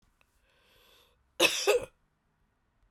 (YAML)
cough_length: 2.9 s
cough_amplitude: 10663
cough_signal_mean_std_ratio: 0.28
survey_phase: beta (2021-08-13 to 2022-03-07)
age: 45-64
gender: Female
wearing_mask: 'No'
symptom_cough_any: true
symptom_runny_or_blocked_nose: true
symptom_shortness_of_breath: true
symptom_fatigue: true
symptom_loss_of_taste: true
symptom_onset: 4 days
smoker_status: Ex-smoker
respiratory_condition_asthma: false
respiratory_condition_other: false
recruitment_source: Test and Trace
submission_delay: 2 days
covid_test_result: Positive
covid_test_method: RT-qPCR
covid_ct_value: 22.2
covid_ct_gene: ORF1ab gene